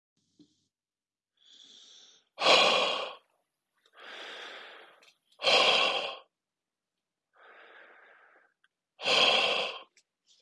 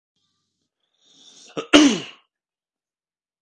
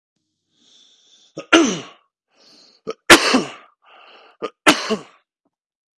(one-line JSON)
{"exhalation_length": "10.4 s", "exhalation_amplitude": 13462, "exhalation_signal_mean_std_ratio": 0.37, "cough_length": "3.4 s", "cough_amplitude": 32768, "cough_signal_mean_std_ratio": 0.23, "three_cough_length": "6.0 s", "three_cough_amplitude": 32768, "three_cough_signal_mean_std_ratio": 0.28, "survey_phase": "beta (2021-08-13 to 2022-03-07)", "age": "18-44", "gender": "Male", "wearing_mask": "No", "symptom_none": true, "smoker_status": "Never smoked", "respiratory_condition_asthma": true, "respiratory_condition_other": false, "recruitment_source": "Test and Trace", "submission_delay": "0 days", "covid_test_result": "Negative", "covid_test_method": "RT-qPCR"}